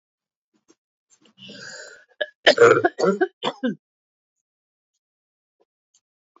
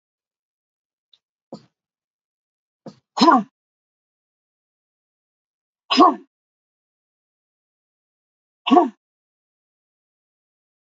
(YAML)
cough_length: 6.4 s
cough_amplitude: 28688
cough_signal_mean_std_ratio: 0.27
exhalation_length: 10.9 s
exhalation_amplitude: 27429
exhalation_signal_mean_std_ratio: 0.19
survey_phase: beta (2021-08-13 to 2022-03-07)
age: 45-64
gender: Female
wearing_mask: 'No'
symptom_cough_any: true
symptom_runny_or_blocked_nose: true
symptom_diarrhoea: true
symptom_fatigue: true
symptom_headache: true
symptom_onset: 2 days
smoker_status: Never smoked
respiratory_condition_asthma: false
respiratory_condition_other: false
recruitment_source: Test and Trace
submission_delay: 2 days
covid_test_result: Positive
covid_test_method: RT-qPCR
covid_ct_value: 20.2
covid_ct_gene: ORF1ab gene
covid_ct_mean: 21.1
covid_viral_load: 120000 copies/ml
covid_viral_load_category: Low viral load (10K-1M copies/ml)